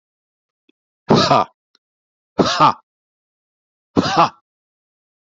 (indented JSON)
{
  "exhalation_length": "5.2 s",
  "exhalation_amplitude": 32768,
  "exhalation_signal_mean_std_ratio": 0.33,
  "survey_phase": "beta (2021-08-13 to 2022-03-07)",
  "age": "45-64",
  "gender": "Male",
  "wearing_mask": "No",
  "symptom_none": true,
  "smoker_status": "Ex-smoker",
  "respiratory_condition_asthma": false,
  "respiratory_condition_other": false,
  "recruitment_source": "REACT",
  "submission_delay": "1 day",
  "covid_test_result": "Negative",
  "covid_test_method": "RT-qPCR",
  "influenza_a_test_result": "Negative",
  "influenza_b_test_result": "Negative"
}